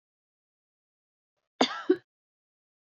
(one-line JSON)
{"cough_length": "3.0 s", "cough_amplitude": 15008, "cough_signal_mean_std_ratio": 0.18, "survey_phase": "beta (2021-08-13 to 2022-03-07)", "age": "45-64", "gender": "Female", "wearing_mask": "No", "symptom_cough_any": true, "symptom_fatigue": true, "symptom_other": true, "symptom_onset": "11 days", "smoker_status": "Never smoked", "respiratory_condition_asthma": false, "respiratory_condition_other": false, "recruitment_source": "REACT", "submission_delay": "1 day", "covid_test_result": "Negative", "covid_test_method": "RT-qPCR", "influenza_a_test_result": "Unknown/Void", "influenza_b_test_result": "Unknown/Void"}